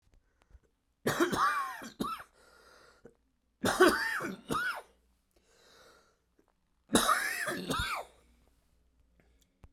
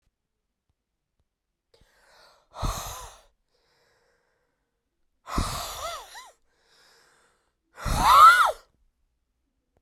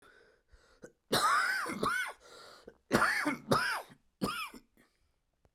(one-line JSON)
{"three_cough_length": "9.7 s", "three_cough_amplitude": 9996, "three_cough_signal_mean_std_ratio": 0.42, "exhalation_length": "9.8 s", "exhalation_amplitude": 19447, "exhalation_signal_mean_std_ratio": 0.26, "cough_length": "5.5 s", "cough_amplitude": 7235, "cough_signal_mean_std_ratio": 0.52, "survey_phase": "beta (2021-08-13 to 2022-03-07)", "age": "45-64", "gender": "Male", "wearing_mask": "No", "symptom_cough_any": true, "symptom_runny_or_blocked_nose": true, "symptom_headache": true, "symptom_change_to_sense_of_smell_or_taste": true, "symptom_onset": "3 days", "smoker_status": "Never smoked", "respiratory_condition_asthma": false, "respiratory_condition_other": false, "recruitment_source": "Test and Trace", "submission_delay": "1 day", "covid_test_result": "Positive", "covid_test_method": "RT-qPCR"}